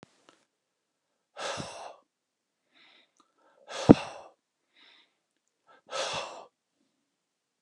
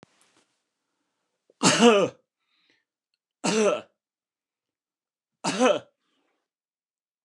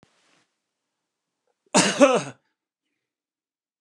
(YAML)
exhalation_length: 7.6 s
exhalation_amplitude: 29203
exhalation_signal_mean_std_ratio: 0.15
three_cough_length: 7.2 s
three_cough_amplitude: 25008
three_cough_signal_mean_std_ratio: 0.3
cough_length: 3.8 s
cough_amplitude: 28670
cough_signal_mean_std_ratio: 0.25
survey_phase: beta (2021-08-13 to 2022-03-07)
age: 65+
gender: Male
wearing_mask: 'No'
symptom_none: true
smoker_status: Never smoked
respiratory_condition_asthma: false
respiratory_condition_other: false
recruitment_source: REACT
submission_delay: 2 days
covid_test_result: Negative
covid_test_method: RT-qPCR